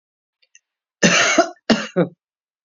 {"cough_length": "2.6 s", "cough_amplitude": 31410, "cough_signal_mean_std_ratio": 0.4, "survey_phase": "beta (2021-08-13 to 2022-03-07)", "age": "45-64", "gender": "Female", "wearing_mask": "No", "symptom_cough_any": true, "symptom_runny_or_blocked_nose": true, "symptom_sore_throat": true, "symptom_abdominal_pain": true, "symptom_onset": "4 days", "smoker_status": "Current smoker (1 to 10 cigarettes per day)", "respiratory_condition_asthma": true, "respiratory_condition_other": false, "recruitment_source": "Test and Trace", "submission_delay": "2 days", "covid_test_result": "Positive", "covid_test_method": "RT-qPCR", "covid_ct_value": 28.5, "covid_ct_gene": "N gene"}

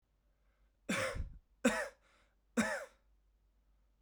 {"three_cough_length": "4.0 s", "three_cough_amplitude": 3987, "three_cough_signal_mean_std_ratio": 0.37, "survey_phase": "beta (2021-08-13 to 2022-03-07)", "age": "18-44", "gender": "Male", "wearing_mask": "No", "symptom_cough_any": true, "symptom_runny_or_blocked_nose": true, "symptom_fatigue": true, "symptom_fever_high_temperature": true, "symptom_headache": true, "symptom_onset": "3 days", "smoker_status": "Never smoked", "respiratory_condition_asthma": false, "respiratory_condition_other": false, "recruitment_source": "Test and Trace", "submission_delay": "1 day", "covid_test_result": "Positive", "covid_test_method": "RT-qPCR", "covid_ct_value": 16.4, "covid_ct_gene": "ORF1ab gene", "covid_ct_mean": 17.1, "covid_viral_load": "2500000 copies/ml", "covid_viral_load_category": "High viral load (>1M copies/ml)"}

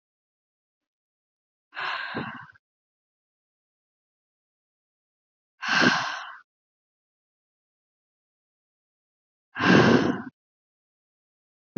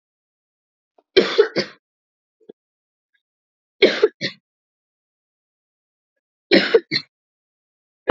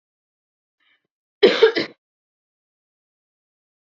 {"exhalation_length": "11.8 s", "exhalation_amplitude": 18522, "exhalation_signal_mean_std_ratio": 0.26, "three_cough_length": "8.1 s", "three_cough_amplitude": 32767, "three_cough_signal_mean_std_ratio": 0.24, "cough_length": "3.9 s", "cough_amplitude": 28024, "cough_signal_mean_std_ratio": 0.21, "survey_phase": "alpha (2021-03-01 to 2021-08-12)", "age": "18-44", "gender": "Female", "wearing_mask": "No", "symptom_none": true, "smoker_status": "Never smoked", "respiratory_condition_asthma": false, "respiratory_condition_other": false, "recruitment_source": "REACT", "submission_delay": "2 days", "covid_test_result": "Negative", "covid_test_method": "RT-qPCR"}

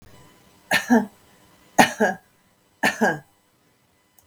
{"three_cough_length": "4.3 s", "three_cough_amplitude": 32557, "three_cough_signal_mean_std_ratio": 0.33, "survey_phase": "beta (2021-08-13 to 2022-03-07)", "age": "45-64", "gender": "Female", "wearing_mask": "No", "symptom_none": true, "smoker_status": "Current smoker (e-cigarettes or vapes only)", "respiratory_condition_asthma": false, "respiratory_condition_other": false, "recruitment_source": "REACT", "submission_delay": "2 days", "covid_test_result": "Negative", "covid_test_method": "RT-qPCR", "influenza_a_test_result": "Negative", "influenza_b_test_result": "Negative"}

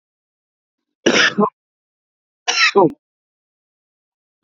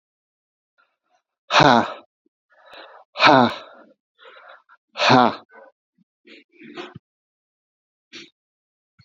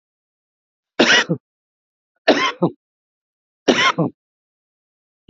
{"cough_length": "4.4 s", "cough_amplitude": 29786, "cough_signal_mean_std_ratio": 0.32, "exhalation_length": "9.0 s", "exhalation_amplitude": 28261, "exhalation_signal_mean_std_ratio": 0.27, "three_cough_length": "5.3 s", "three_cough_amplitude": 32343, "three_cough_signal_mean_std_ratio": 0.33, "survey_phase": "beta (2021-08-13 to 2022-03-07)", "age": "45-64", "gender": "Male", "wearing_mask": "No", "symptom_none": true, "smoker_status": "Current smoker (11 or more cigarettes per day)", "respiratory_condition_asthma": false, "respiratory_condition_other": false, "recruitment_source": "REACT", "submission_delay": "7 days", "covid_test_result": "Negative", "covid_test_method": "RT-qPCR", "influenza_a_test_result": "Negative", "influenza_b_test_result": "Negative"}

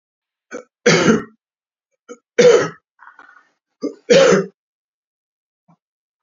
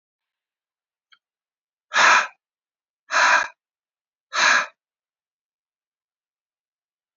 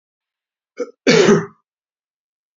{"three_cough_length": "6.2 s", "three_cough_amplitude": 29635, "three_cough_signal_mean_std_ratio": 0.34, "exhalation_length": "7.2 s", "exhalation_amplitude": 24903, "exhalation_signal_mean_std_ratio": 0.29, "cough_length": "2.6 s", "cough_amplitude": 30175, "cough_signal_mean_std_ratio": 0.33, "survey_phase": "beta (2021-08-13 to 2022-03-07)", "age": "45-64", "gender": "Male", "wearing_mask": "No", "symptom_diarrhoea": true, "symptom_fatigue": true, "symptom_onset": "12 days", "smoker_status": "Ex-smoker", "respiratory_condition_asthma": false, "respiratory_condition_other": false, "recruitment_source": "REACT", "submission_delay": "3 days", "covid_test_result": "Negative", "covid_test_method": "RT-qPCR", "influenza_a_test_result": "Unknown/Void", "influenza_b_test_result": "Unknown/Void"}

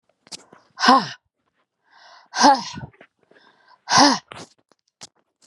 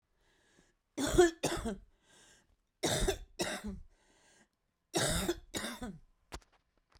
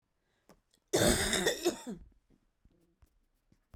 {"exhalation_length": "5.5 s", "exhalation_amplitude": 30553, "exhalation_signal_mean_std_ratio": 0.31, "three_cough_length": "7.0 s", "three_cough_amplitude": 7007, "three_cough_signal_mean_std_ratio": 0.4, "cough_length": "3.8 s", "cough_amplitude": 6883, "cough_signal_mean_std_ratio": 0.38, "survey_phase": "beta (2021-08-13 to 2022-03-07)", "age": "65+", "gender": "Female", "wearing_mask": "No", "symptom_cough_any": true, "symptom_runny_or_blocked_nose": true, "symptom_shortness_of_breath": true, "symptom_sore_throat": true, "symptom_fatigue": true, "symptom_headache": true, "symptom_onset": "4 days", "smoker_status": "Ex-smoker", "respiratory_condition_asthma": false, "respiratory_condition_other": false, "recruitment_source": "Test and Trace", "submission_delay": "1 day", "covid_test_result": "Positive", "covid_test_method": "RT-qPCR", "covid_ct_value": 21.7, "covid_ct_gene": "ORF1ab gene"}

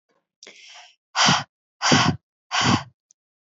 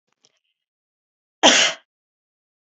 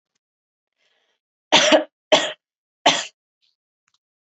{"exhalation_length": "3.6 s", "exhalation_amplitude": 25467, "exhalation_signal_mean_std_ratio": 0.41, "cough_length": "2.7 s", "cough_amplitude": 32341, "cough_signal_mean_std_ratio": 0.25, "three_cough_length": "4.4 s", "three_cough_amplitude": 30966, "three_cough_signal_mean_std_ratio": 0.28, "survey_phase": "beta (2021-08-13 to 2022-03-07)", "age": "18-44", "gender": "Female", "wearing_mask": "Yes", "symptom_none": true, "smoker_status": "Never smoked", "respiratory_condition_asthma": false, "respiratory_condition_other": false, "recruitment_source": "REACT", "submission_delay": "1 day", "covid_test_result": "Negative", "covid_test_method": "RT-qPCR", "influenza_a_test_result": "Negative", "influenza_b_test_result": "Negative"}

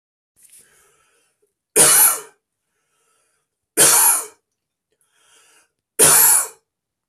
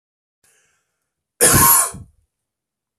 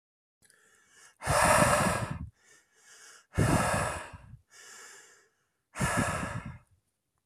{"three_cough_length": "7.1 s", "three_cough_amplitude": 32768, "three_cough_signal_mean_std_ratio": 0.36, "cough_length": "3.0 s", "cough_amplitude": 32084, "cough_signal_mean_std_ratio": 0.34, "exhalation_length": "7.3 s", "exhalation_amplitude": 11454, "exhalation_signal_mean_std_ratio": 0.46, "survey_phase": "beta (2021-08-13 to 2022-03-07)", "age": "18-44", "gender": "Male", "wearing_mask": "No", "symptom_none": true, "smoker_status": "Never smoked", "respiratory_condition_asthma": false, "respiratory_condition_other": false, "recruitment_source": "REACT", "submission_delay": "1 day", "covid_test_result": "Negative", "covid_test_method": "RT-qPCR", "influenza_a_test_result": "Negative", "influenza_b_test_result": "Negative"}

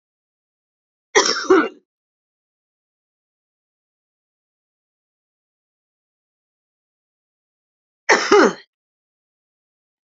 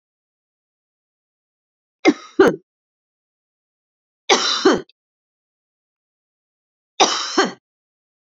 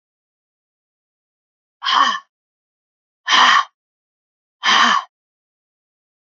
{"cough_length": "10.1 s", "cough_amplitude": 30066, "cough_signal_mean_std_ratio": 0.21, "three_cough_length": "8.4 s", "three_cough_amplitude": 32767, "three_cough_signal_mean_std_ratio": 0.27, "exhalation_length": "6.3 s", "exhalation_amplitude": 29251, "exhalation_signal_mean_std_ratio": 0.33, "survey_phase": "beta (2021-08-13 to 2022-03-07)", "age": "65+", "gender": "Female", "wearing_mask": "No", "symptom_cough_any": true, "symptom_new_continuous_cough": true, "symptom_runny_or_blocked_nose": true, "symptom_sore_throat": true, "symptom_fatigue": true, "symptom_headache": true, "symptom_onset": "4 days", "smoker_status": "Never smoked", "respiratory_condition_asthma": false, "respiratory_condition_other": false, "recruitment_source": "Test and Trace", "submission_delay": "1 day", "covid_test_result": "Negative", "covid_test_method": "RT-qPCR"}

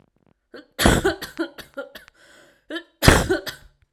{"three_cough_length": "3.9 s", "three_cough_amplitude": 32768, "three_cough_signal_mean_std_ratio": 0.36, "survey_phase": "alpha (2021-03-01 to 2021-08-12)", "age": "18-44", "gender": "Female", "wearing_mask": "No", "symptom_cough_any": true, "smoker_status": "Never smoked", "respiratory_condition_asthma": false, "respiratory_condition_other": false, "recruitment_source": "REACT", "submission_delay": "6 days", "covid_test_result": "Negative", "covid_test_method": "RT-qPCR"}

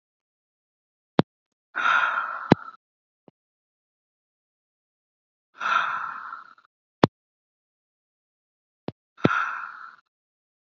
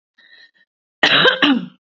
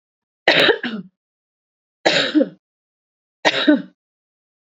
{"exhalation_length": "10.7 s", "exhalation_amplitude": 32767, "exhalation_signal_mean_std_ratio": 0.26, "cough_length": "2.0 s", "cough_amplitude": 29603, "cough_signal_mean_std_ratio": 0.45, "three_cough_length": "4.7 s", "three_cough_amplitude": 28098, "three_cough_signal_mean_std_ratio": 0.38, "survey_phase": "beta (2021-08-13 to 2022-03-07)", "age": "18-44", "gender": "Female", "wearing_mask": "No", "symptom_cough_any": true, "symptom_headache": true, "symptom_onset": "4 days", "smoker_status": "Never smoked", "respiratory_condition_asthma": false, "respiratory_condition_other": false, "recruitment_source": "Test and Trace", "submission_delay": "2 days", "covid_test_result": "Positive", "covid_test_method": "ePCR"}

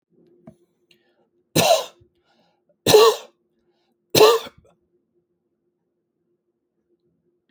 {"three_cough_length": "7.5 s", "three_cough_amplitude": 30157, "three_cough_signal_mean_std_ratio": 0.26, "survey_phase": "alpha (2021-03-01 to 2021-08-12)", "age": "45-64", "gender": "Male", "wearing_mask": "No", "symptom_none": true, "smoker_status": "Never smoked", "respiratory_condition_asthma": false, "respiratory_condition_other": false, "recruitment_source": "REACT", "submission_delay": "1 day", "covid_test_result": "Negative", "covid_test_method": "RT-qPCR"}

